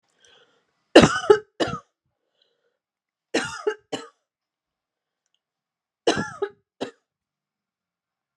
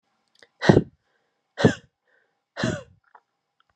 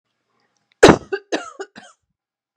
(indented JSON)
{
  "three_cough_length": "8.4 s",
  "three_cough_amplitude": 32768,
  "three_cough_signal_mean_std_ratio": 0.21,
  "exhalation_length": "3.8 s",
  "exhalation_amplitude": 30742,
  "exhalation_signal_mean_std_ratio": 0.24,
  "cough_length": "2.6 s",
  "cough_amplitude": 32768,
  "cough_signal_mean_std_ratio": 0.22,
  "survey_phase": "beta (2021-08-13 to 2022-03-07)",
  "age": "18-44",
  "gender": "Female",
  "wearing_mask": "No",
  "symptom_none": true,
  "smoker_status": "Never smoked",
  "respiratory_condition_asthma": false,
  "respiratory_condition_other": false,
  "recruitment_source": "REACT",
  "submission_delay": "2 days",
  "covid_test_result": "Negative",
  "covid_test_method": "RT-qPCR"
}